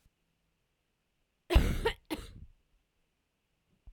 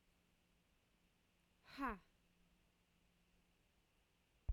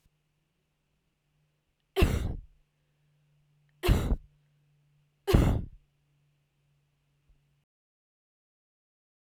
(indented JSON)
{
  "cough_length": "3.9 s",
  "cough_amplitude": 12099,
  "cough_signal_mean_std_ratio": 0.25,
  "exhalation_length": "4.5 s",
  "exhalation_amplitude": 899,
  "exhalation_signal_mean_std_ratio": 0.22,
  "three_cough_length": "9.4 s",
  "three_cough_amplitude": 14964,
  "three_cough_signal_mean_std_ratio": 0.26,
  "survey_phase": "beta (2021-08-13 to 2022-03-07)",
  "age": "18-44",
  "gender": "Female",
  "wearing_mask": "No",
  "symptom_cough_any": true,
  "symptom_fatigue": true,
  "symptom_fever_high_temperature": true,
  "symptom_headache": true,
  "symptom_change_to_sense_of_smell_or_taste": true,
  "symptom_loss_of_taste": true,
  "symptom_onset": "2 days",
  "smoker_status": "Ex-smoker",
  "respiratory_condition_asthma": false,
  "respiratory_condition_other": false,
  "recruitment_source": "Test and Trace",
  "submission_delay": "1 day",
  "covid_test_result": "Positive",
  "covid_test_method": "LAMP"
}